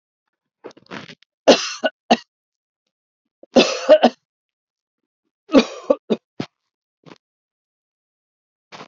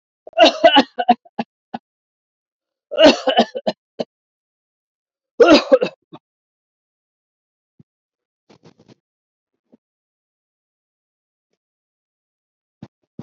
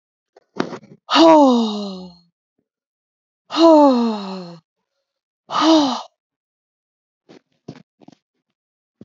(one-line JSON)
{"three_cough_length": "8.9 s", "three_cough_amplitude": 32768, "three_cough_signal_mean_std_ratio": 0.24, "cough_length": "13.2 s", "cough_amplitude": 32768, "cough_signal_mean_std_ratio": 0.24, "exhalation_length": "9.0 s", "exhalation_amplitude": 28541, "exhalation_signal_mean_std_ratio": 0.37, "survey_phase": "beta (2021-08-13 to 2022-03-07)", "age": "65+", "gender": "Female", "wearing_mask": "No", "symptom_none": true, "smoker_status": "Never smoked", "respiratory_condition_asthma": false, "respiratory_condition_other": false, "recruitment_source": "REACT", "submission_delay": "2 days", "covid_test_result": "Negative", "covid_test_method": "RT-qPCR", "influenza_a_test_result": "Negative", "influenza_b_test_result": "Negative"}